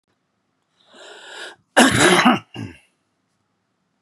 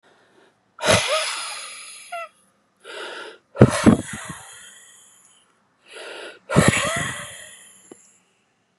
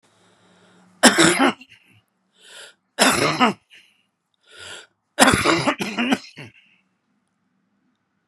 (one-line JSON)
{"cough_length": "4.0 s", "cough_amplitude": 32550, "cough_signal_mean_std_ratio": 0.33, "exhalation_length": "8.8 s", "exhalation_amplitude": 32768, "exhalation_signal_mean_std_ratio": 0.35, "three_cough_length": "8.3 s", "three_cough_amplitude": 32768, "three_cough_signal_mean_std_ratio": 0.36, "survey_phase": "beta (2021-08-13 to 2022-03-07)", "age": "45-64", "gender": "Male", "wearing_mask": "No", "symptom_none": true, "smoker_status": "Never smoked", "respiratory_condition_asthma": true, "respiratory_condition_other": false, "recruitment_source": "REACT", "submission_delay": "2 days", "covid_test_result": "Negative", "covid_test_method": "RT-qPCR"}